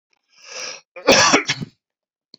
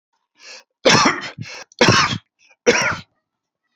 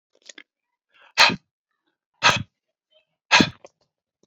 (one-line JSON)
{"cough_length": "2.4 s", "cough_amplitude": 32184, "cough_signal_mean_std_ratio": 0.38, "three_cough_length": "3.8 s", "three_cough_amplitude": 32767, "three_cough_signal_mean_std_ratio": 0.43, "exhalation_length": "4.3 s", "exhalation_amplitude": 31021, "exhalation_signal_mean_std_ratio": 0.25, "survey_phase": "alpha (2021-03-01 to 2021-08-12)", "age": "45-64", "gender": "Male", "wearing_mask": "No", "symptom_none": true, "smoker_status": "Never smoked", "respiratory_condition_asthma": false, "respiratory_condition_other": false, "recruitment_source": "REACT", "submission_delay": "1 day", "covid_test_result": "Negative", "covid_test_method": "RT-qPCR"}